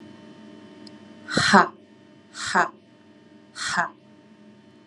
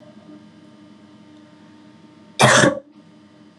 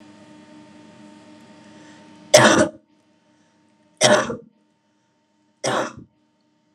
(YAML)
exhalation_length: 4.9 s
exhalation_amplitude: 31412
exhalation_signal_mean_std_ratio: 0.33
cough_length: 3.6 s
cough_amplitude: 31418
cough_signal_mean_std_ratio: 0.3
three_cough_length: 6.7 s
three_cough_amplitude: 32768
three_cough_signal_mean_std_ratio: 0.29
survey_phase: beta (2021-08-13 to 2022-03-07)
age: 18-44
gender: Female
wearing_mask: 'No'
symptom_none: true
smoker_status: Never smoked
respiratory_condition_asthma: false
respiratory_condition_other: false
recruitment_source: REACT
submission_delay: 1 day
covid_test_result: Negative
covid_test_method: RT-qPCR
influenza_a_test_result: Unknown/Void
influenza_b_test_result: Unknown/Void